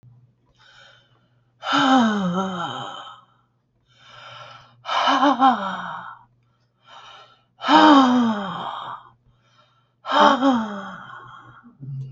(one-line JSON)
{"exhalation_length": "12.1 s", "exhalation_amplitude": 32768, "exhalation_signal_mean_std_ratio": 0.46, "survey_phase": "beta (2021-08-13 to 2022-03-07)", "age": "65+", "gender": "Female", "wearing_mask": "No", "symptom_none": true, "smoker_status": "Ex-smoker", "respiratory_condition_asthma": false, "respiratory_condition_other": false, "recruitment_source": "REACT", "submission_delay": "2 days", "covid_test_result": "Negative", "covid_test_method": "RT-qPCR"}